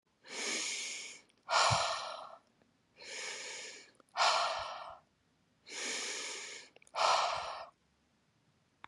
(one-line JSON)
{"exhalation_length": "8.9 s", "exhalation_amplitude": 6283, "exhalation_signal_mean_std_ratio": 0.52, "survey_phase": "beta (2021-08-13 to 2022-03-07)", "age": "18-44", "gender": "Female", "wearing_mask": "No", "symptom_runny_or_blocked_nose": true, "symptom_diarrhoea": true, "symptom_change_to_sense_of_smell_or_taste": true, "smoker_status": "Current smoker (1 to 10 cigarettes per day)", "respiratory_condition_asthma": false, "respiratory_condition_other": false, "recruitment_source": "Test and Trace", "submission_delay": "2 days", "covid_test_result": "Positive", "covid_test_method": "RT-qPCR", "covid_ct_value": 18.6, "covid_ct_gene": "ORF1ab gene"}